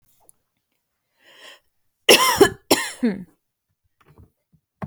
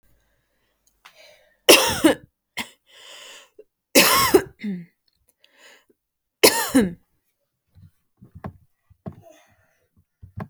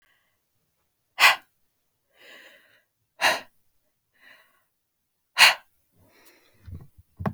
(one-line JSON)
{"cough_length": "4.9 s", "cough_amplitude": 29942, "cough_signal_mean_std_ratio": 0.28, "three_cough_length": "10.5 s", "three_cough_amplitude": 32768, "three_cough_signal_mean_std_ratio": 0.28, "exhalation_length": "7.3 s", "exhalation_amplitude": 28886, "exhalation_signal_mean_std_ratio": 0.21, "survey_phase": "beta (2021-08-13 to 2022-03-07)", "age": "18-44", "gender": "Female", "wearing_mask": "No", "symptom_headache": true, "smoker_status": "Never smoked", "respiratory_condition_asthma": false, "respiratory_condition_other": false, "recruitment_source": "REACT", "submission_delay": "0 days", "covid_test_result": "Negative", "covid_test_method": "RT-qPCR"}